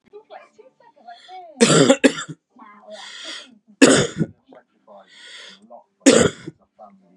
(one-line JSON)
{"three_cough_length": "7.2 s", "three_cough_amplitude": 32768, "three_cough_signal_mean_std_ratio": 0.33, "survey_phase": "beta (2021-08-13 to 2022-03-07)", "age": "18-44", "gender": "Male", "wearing_mask": "No", "symptom_cough_any": true, "symptom_new_continuous_cough": true, "symptom_runny_or_blocked_nose": true, "symptom_sore_throat": true, "symptom_abdominal_pain": true, "symptom_diarrhoea": true, "symptom_fatigue": true, "symptom_fever_high_temperature": true, "symptom_headache": true, "symptom_change_to_sense_of_smell_or_taste": true, "symptom_onset": "3 days", "smoker_status": "Never smoked", "respiratory_condition_asthma": false, "respiratory_condition_other": false, "recruitment_source": "Test and Trace", "submission_delay": "2 days", "covid_test_result": "Positive", "covid_test_method": "RT-qPCR", "covid_ct_value": 17.4, "covid_ct_gene": "N gene"}